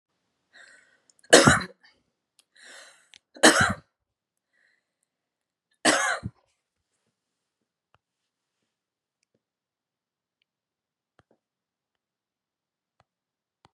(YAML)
three_cough_length: 13.7 s
three_cough_amplitude: 32263
three_cough_signal_mean_std_ratio: 0.18
survey_phase: beta (2021-08-13 to 2022-03-07)
age: 18-44
gender: Female
wearing_mask: 'No'
symptom_sore_throat: true
symptom_headache: true
symptom_change_to_sense_of_smell_or_taste: true
symptom_onset: 2 days
smoker_status: Never smoked
respiratory_condition_asthma: true
respiratory_condition_other: false
recruitment_source: REACT
submission_delay: 1 day
covid_test_result: Negative
covid_test_method: RT-qPCR
influenza_a_test_result: Negative
influenza_b_test_result: Negative